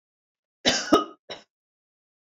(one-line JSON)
{"cough_length": "2.4 s", "cough_amplitude": 19916, "cough_signal_mean_std_ratio": 0.28, "survey_phase": "beta (2021-08-13 to 2022-03-07)", "age": "65+", "gender": "Female", "wearing_mask": "No", "symptom_none": true, "smoker_status": "Never smoked", "respiratory_condition_asthma": false, "respiratory_condition_other": false, "recruitment_source": "REACT", "submission_delay": "1 day", "covid_test_result": "Negative", "covid_test_method": "RT-qPCR"}